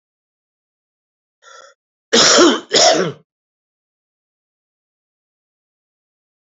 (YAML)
cough_length: 6.6 s
cough_amplitude: 30708
cough_signal_mean_std_ratio: 0.29
survey_phase: beta (2021-08-13 to 2022-03-07)
age: 65+
gender: Male
wearing_mask: 'No'
symptom_cough_any: true
symptom_shortness_of_breath: true
symptom_onset: 6 days
smoker_status: Never smoked
respiratory_condition_asthma: false
respiratory_condition_other: false
recruitment_source: Test and Trace
submission_delay: 2 days
covid_test_result: Positive
covid_test_method: RT-qPCR
covid_ct_value: 25.9
covid_ct_gene: N gene
covid_ct_mean: 26.0
covid_viral_load: 3000 copies/ml
covid_viral_load_category: Minimal viral load (< 10K copies/ml)